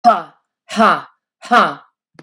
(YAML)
exhalation_length: 2.2 s
exhalation_amplitude: 32768
exhalation_signal_mean_std_ratio: 0.43
survey_phase: beta (2021-08-13 to 2022-03-07)
age: 45-64
gender: Female
wearing_mask: 'No'
symptom_none: true
smoker_status: Ex-smoker
respiratory_condition_asthma: false
respiratory_condition_other: false
recruitment_source: REACT
submission_delay: 1 day
covid_test_result: Negative
covid_test_method: RT-qPCR